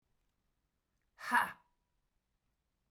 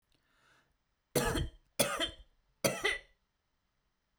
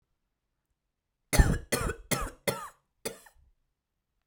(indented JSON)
{
  "exhalation_length": "2.9 s",
  "exhalation_amplitude": 4291,
  "exhalation_signal_mean_std_ratio": 0.21,
  "three_cough_length": "4.2 s",
  "three_cough_amplitude": 7178,
  "three_cough_signal_mean_std_ratio": 0.37,
  "cough_length": "4.3 s",
  "cough_amplitude": 15941,
  "cough_signal_mean_std_ratio": 0.29,
  "survey_phase": "beta (2021-08-13 to 2022-03-07)",
  "age": "45-64",
  "gender": "Female",
  "wearing_mask": "No",
  "symptom_cough_any": true,
  "symptom_runny_or_blocked_nose": true,
  "symptom_sore_throat": true,
  "symptom_diarrhoea": true,
  "symptom_fatigue": true,
  "symptom_headache": true,
  "symptom_change_to_sense_of_smell_or_taste": true,
  "symptom_loss_of_taste": true,
  "symptom_onset": "6 days",
  "smoker_status": "Ex-smoker",
  "respiratory_condition_asthma": false,
  "respiratory_condition_other": false,
  "recruitment_source": "Test and Trace",
  "submission_delay": "2 days",
  "covid_test_result": "Positive",
  "covid_test_method": "RT-qPCR"
}